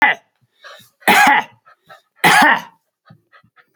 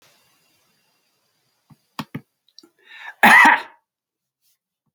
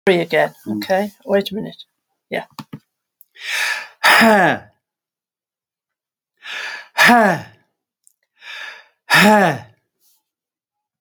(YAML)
three_cough_length: 3.8 s
three_cough_amplitude: 31530
three_cough_signal_mean_std_ratio: 0.41
cough_length: 4.9 s
cough_amplitude: 30870
cough_signal_mean_std_ratio: 0.24
exhalation_length: 11.0 s
exhalation_amplitude: 31385
exhalation_signal_mean_std_ratio: 0.41
survey_phase: alpha (2021-03-01 to 2021-08-12)
age: 65+
gender: Male
wearing_mask: 'No'
symptom_none: true
smoker_status: Ex-smoker
respiratory_condition_asthma: false
respiratory_condition_other: false
recruitment_source: REACT
submission_delay: 1 day
covid_test_result: Negative
covid_test_method: RT-qPCR